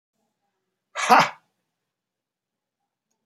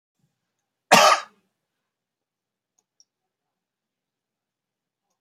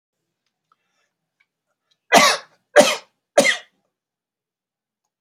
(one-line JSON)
{"exhalation_length": "3.3 s", "exhalation_amplitude": 27117, "exhalation_signal_mean_std_ratio": 0.21, "cough_length": "5.2 s", "cough_amplitude": 29306, "cough_signal_mean_std_ratio": 0.18, "three_cough_length": "5.2 s", "three_cough_amplitude": 31062, "three_cough_signal_mean_std_ratio": 0.26, "survey_phase": "alpha (2021-03-01 to 2021-08-12)", "age": "65+", "gender": "Male", "wearing_mask": "No", "symptom_none": true, "smoker_status": "Never smoked", "respiratory_condition_asthma": false, "respiratory_condition_other": false, "recruitment_source": "REACT", "submission_delay": "2 days", "covid_test_result": "Negative", "covid_test_method": "RT-qPCR"}